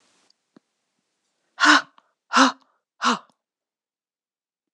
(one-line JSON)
{"exhalation_length": "4.7 s", "exhalation_amplitude": 25630, "exhalation_signal_mean_std_ratio": 0.26, "survey_phase": "beta (2021-08-13 to 2022-03-07)", "age": "45-64", "gender": "Female", "wearing_mask": "No", "symptom_cough_any": true, "symptom_runny_or_blocked_nose": true, "symptom_onset": "7 days", "smoker_status": "Never smoked", "respiratory_condition_asthma": false, "respiratory_condition_other": false, "recruitment_source": "Test and Trace", "submission_delay": "1 day", "covid_test_result": "Positive", "covid_test_method": "ePCR"}